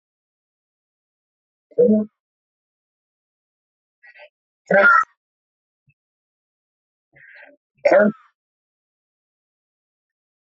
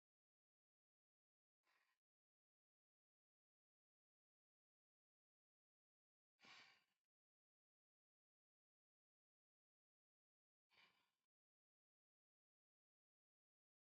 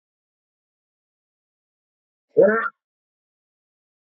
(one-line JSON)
{"three_cough_length": "10.4 s", "three_cough_amplitude": 21667, "three_cough_signal_mean_std_ratio": 0.24, "exhalation_length": "14.0 s", "exhalation_amplitude": 62, "exhalation_signal_mean_std_ratio": 0.16, "cough_length": "4.0 s", "cough_amplitude": 18446, "cough_signal_mean_std_ratio": 0.21, "survey_phase": "beta (2021-08-13 to 2022-03-07)", "age": "45-64", "gender": "Female", "wearing_mask": "No", "symptom_none": true, "smoker_status": "Current smoker (1 to 10 cigarettes per day)", "respiratory_condition_asthma": false, "respiratory_condition_other": false, "recruitment_source": "REACT", "submission_delay": "3 days", "covid_test_result": "Negative", "covid_test_method": "RT-qPCR"}